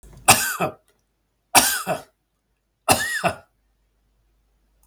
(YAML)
three_cough_length: 4.9 s
three_cough_amplitude: 32768
three_cough_signal_mean_std_ratio: 0.34
survey_phase: beta (2021-08-13 to 2022-03-07)
age: 65+
gender: Male
wearing_mask: 'No'
symptom_change_to_sense_of_smell_or_taste: true
smoker_status: Never smoked
respiratory_condition_asthma: false
respiratory_condition_other: false
recruitment_source: Test and Trace
submission_delay: 1 day
covid_test_result: Positive
covid_test_method: LFT